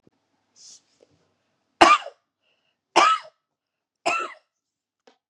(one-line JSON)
{"three_cough_length": "5.3 s", "three_cough_amplitude": 32768, "three_cough_signal_mean_std_ratio": 0.25, "survey_phase": "beta (2021-08-13 to 2022-03-07)", "age": "45-64", "gender": "Female", "wearing_mask": "No", "symptom_none": true, "smoker_status": "Ex-smoker", "respiratory_condition_asthma": false, "respiratory_condition_other": false, "recruitment_source": "REACT", "submission_delay": "2 days", "covid_test_result": "Negative", "covid_test_method": "RT-qPCR", "influenza_a_test_result": "Negative", "influenza_b_test_result": "Negative"}